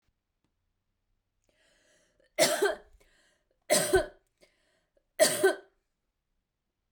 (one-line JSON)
{"three_cough_length": "6.9 s", "three_cough_amplitude": 10795, "three_cough_signal_mean_std_ratio": 0.3, "survey_phase": "beta (2021-08-13 to 2022-03-07)", "age": "45-64", "gender": "Female", "wearing_mask": "No", "symptom_none": true, "smoker_status": "Never smoked", "respiratory_condition_asthma": false, "respiratory_condition_other": false, "recruitment_source": "REACT", "submission_delay": "4 days", "covid_test_result": "Negative", "covid_test_method": "RT-qPCR"}